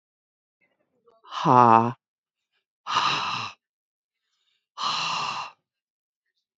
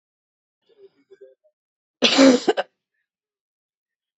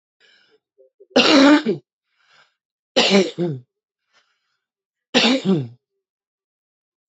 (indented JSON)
{
  "exhalation_length": "6.6 s",
  "exhalation_amplitude": 24549,
  "exhalation_signal_mean_std_ratio": 0.31,
  "cough_length": "4.2 s",
  "cough_amplitude": 26955,
  "cough_signal_mean_std_ratio": 0.26,
  "three_cough_length": "7.1 s",
  "three_cough_amplitude": 30429,
  "three_cough_signal_mean_std_ratio": 0.37,
  "survey_phase": "beta (2021-08-13 to 2022-03-07)",
  "age": "45-64",
  "gender": "Female",
  "wearing_mask": "No",
  "symptom_cough_any": true,
  "symptom_runny_or_blocked_nose": true,
  "symptom_abdominal_pain": true,
  "symptom_fatigue": true,
  "symptom_fever_high_temperature": true,
  "symptom_headache": true,
  "symptom_change_to_sense_of_smell_or_taste": true,
  "symptom_loss_of_taste": true,
  "symptom_other": true,
  "symptom_onset": "3 days",
  "smoker_status": "Current smoker (11 or more cigarettes per day)",
  "respiratory_condition_asthma": false,
  "respiratory_condition_other": false,
  "recruitment_source": "Test and Trace",
  "submission_delay": "1 day",
  "covid_test_result": "Positive",
  "covid_test_method": "RT-qPCR",
  "covid_ct_value": 18.3,
  "covid_ct_gene": "ORF1ab gene",
  "covid_ct_mean": 19.3,
  "covid_viral_load": "470000 copies/ml",
  "covid_viral_load_category": "Low viral load (10K-1M copies/ml)"
}